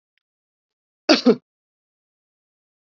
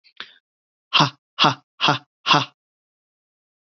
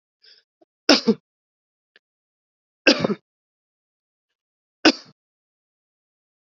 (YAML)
cough_length: 2.9 s
cough_amplitude: 28885
cough_signal_mean_std_ratio: 0.2
exhalation_length: 3.7 s
exhalation_amplitude: 28289
exhalation_signal_mean_std_ratio: 0.31
three_cough_length: 6.6 s
three_cough_amplitude: 32768
three_cough_signal_mean_std_ratio: 0.19
survey_phase: beta (2021-08-13 to 2022-03-07)
age: 18-44
gender: Male
wearing_mask: 'No'
symptom_none: true
smoker_status: Never smoked
respiratory_condition_asthma: false
respiratory_condition_other: false
recruitment_source: REACT
submission_delay: 2 days
covid_test_result: Negative
covid_test_method: RT-qPCR
influenza_a_test_result: Negative
influenza_b_test_result: Negative